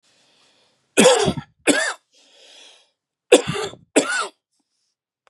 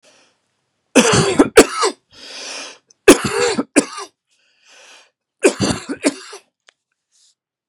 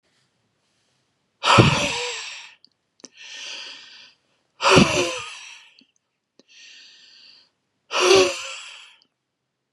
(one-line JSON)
{"cough_length": "5.3 s", "cough_amplitude": 32766, "cough_signal_mean_std_ratio": 0.34, "three_cough_length": "7.7 s", "three_cough_amplitude": 32768, "three_cough_signal_mean_std_ratio": 0.35, "exhalation_length": "9.7 s", "exhalation_amplitude": 31780, "exhalation_signal_mean_std_ratio": 0.34, "survey_phase": "beta (2021-08-13 to 2022-03-07)", "age": "65+", "gender": "Male", "wearing_mask": "No", "symptom_none": true, "smoker_status": "Ex-smoker", "respiratory_condition_asthma": true, "respiratory_condition_other": false, "recruitment_source": "REACT", "submission_delay": "1 day", "covid_test_result": "Negative", "covid_test_method": "RT-qPCR", "influenza_a_test_result": "Negative", "influenza_b_test_result": "Negative"}